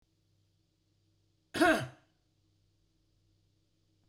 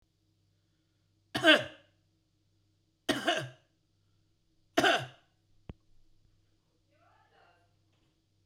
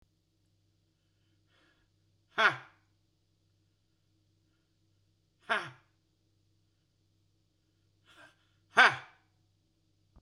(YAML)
cough_length: 4.1 s
cough_amplitude: 6719
cough_signal_mean_std_ratio: 0.21
three_cough_length: 8.5 s
three_cough_amplitude: 12577
three_cough_signal_mean_std_ratio: 0.23
exhalation_length: 10.2 s
exhalation_amplitude: 15081
exhalation_signal_mean_std_ratio: 0.16
survey_phase: beta (2021-08-13 to 2022-03-07)
age: 45-64
gender: Male
wearing_mask: 'No'
symptom_none: true
smoker_status: Ex-smoker
respiratory_condition_asthma: false
respiratory_condition_other: false
recruitment_source: REACT
submission_delay: 1 day
covid_test_result: Negative
covid_test_method: RT-qPCR